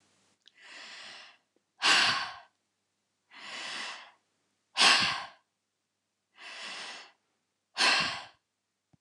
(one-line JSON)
{"exhalation_length": "9.0 s", "exhalation_amplitude": 12078, "exhalation_signal_mean_std_ratio": 0.35, "survey_phase": "beta (2021-08-13 to 2022-03-07)", "age": "65+", "gender": "Female", "wearing_mask": "No", "symptom_runny_or_blocked_nose": true, "symptom_sore_throat": true, "symptom_abdominal_pain": true, "symptom_fatigue": true, "smoker_status": "Current smoker (e-cigarettes or vapes only)", "respiratory_condition_asthma": false, "respiratory_condition_other": false, "recruitment_source": "REACT", "submission_delay": "1 day", "covid_test_result": "Negative", "covid_test_method": "RT-qPCR", "influenza_a_test_result": "Negative", "influenza_b_test_result": "Negative"}